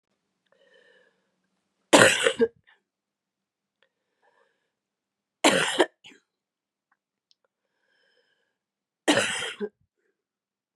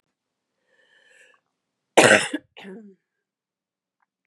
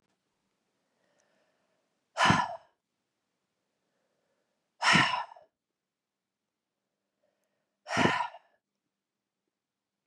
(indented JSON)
{
  "three_cough_length": "10.8 s",
  "three_cough_amplitude": 32686,
  "three_cough_signal_mean_std_ratio": 0.24,
  "cough_length": "4.3 s",
  "cough_amplitude": 32767,
  "cough_signal_mean_std_ratio": 0.21,
  "exhalation_length": "10.1 s",
  "exhalation_amplitude": 11083,
  "exhalation_signal_mean_std_ratio": 0.25,
  "survey_phase": "beta (2021-08-13 to 2022-03-07)",
  "age": "18-44",
  "gender": "Female",
  "wearing_mask": "No",
  "symptom_cough_any": true,
  "symptom_runny_or_blocked_nose": true,
  "symptom_fatigue": true,
  "symptom_change_to_sense_of_smell_or_taste": true,
  "symptom_other": true,
  "symptom_onset": "3 days",
  "smoker_status": "Never smoked",
  "respiratory_condition_asthma": false,
  "respiratory_condition_other": false,
  "recruitment_source": "Test and Trace",
  "submission_delay": "1 day",
  "covid_test_result": "Positive",
  "covid_test_method": "RT-qPCR",
  "covid_ct_value": 12.3,
  "covid_ct_gene": "ORF1ab gene",
  "covid_ct_mean": 12.7,
  "covid_viral_load": "71000000 copies/ml",
  "covid_viral_load_category": "High viral load (>1M copies/ml)"
}